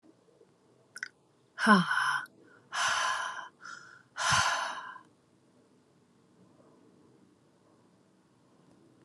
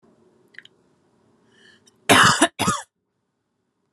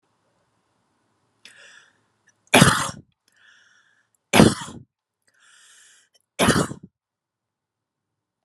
{
  "exhalation_length": "9.0 s",
  "exhalation_amplitude": 12602,
  "exhalation_signal_mean_std_ratio": 0.37,
  "cough_length": "3.9 s",
  "cough_amplitude": 32767,
  "cough_signal_mean_std_ratio": 0.29,
  "three_cough_length": "8.4 s",
  "three_cough_amplitude": 32768,
  "three_cough_signal_mean_std_ratio": 0.23,
  "survey_phase": "beta (2021-08-13 to 2022-03-07)",
  "age": "18-44",
  "gender": "Female",
  "wearing_mask": "No",
  "symptom_none": true,
  "smoker_status": "Never smoked",
  "respiratory_condition_asthma": false,
  "respiratory_condition_other": false,
  "recruitment_source": "REACT",
  "submission_delay": "0 days",
  "covid_test_result": "Negative",
  "covid_test_method": "RT-qPCR"
}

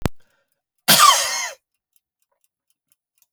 {
  "cough_length": "3.3 s",
  "cough_amplitude": 32767,
  "cough_signal_mean_std_ratio": 0.32,
  "survey_phase": "alpha (2021-03-01 to 2021-08-12)",
  "age": "65+",
  "gender": "Male",
  "wearing_mask": "No",
  "symptom_cough_any": true,
  "symptom_fatigue": true,
  "smoker_status": "Never smoked",
  "respiratory_condition_asthma": false,
  "respiratory_condition_other": false,
  "recruitment_source": "REACT",
  "submission_delay": "3 days",
  "covid_test_result": "Negative",
  "covid_test_method": "RT-qPCR"
}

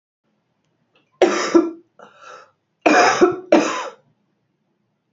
{
  "three_cough_length": "5.1 s",
  "three_cough_amplitude": 30179,
  "three_cough_signal_mean_std_ratio": 0.38,
  "survey_phase": "beta (2021-08-13 to 2022-03-07)",
  "age": "45-64",
  "gender": "Female",
  "wearing_mask": "No",
  "symptom_runny_or_blocked_nose": true,
  "symptom_sore_throat": true,
  "symptom_fatigue": true,
  "symptom_fever_high_temperature": true,
  "symptom_headache": true,
  "symptom_onset": "3 days",
  "smoker_status": "Current smoker (1 to 10 cigarettes per day)",
  "respiratory_condition_asthma": false,
  "respiratory_condition_other": false,
  "recruitment_source": "Test and Trace",
  "submission_delay": "2 days",
  "covid_test_result": "Positive",
  "covid_test_method": "ePCR"
}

